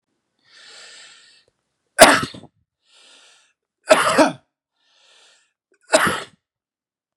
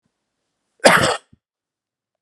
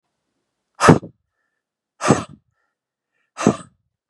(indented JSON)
{
  "three_cough_length": "7.2 s",
  "three_cough_amplitude": 32768,
  "three_cough_signal_mean_std_ratio": 0.26,
  "cough_length": "2.2 s",
  "cough_amplitude": 32768,
  "cough_signal_mean_std_ratio": 0.28,
  "exhalation_length": "4.1 s",
  "exhalation_amplitude": 32768,
  "exhalation_signal_mean_std_ratio": 0.24,
  "survey_phase": "beta (2021-08-13 to 2022-03-07)",
  "age": "45-64",
  "gender": "Male",
  "wearing_mask": "No",
  "symptom_none": true,
  "smoker_status": "Ex-smoker",
  "respiratory_condition_asthma": false,
  "respiratory_condition_other": false,
  "recruitment_source": "Test and Trace",
  "submission_delay": "1 day",
  "covid_test_result": "Negative",
  "covid_test_method": "ePCR"
}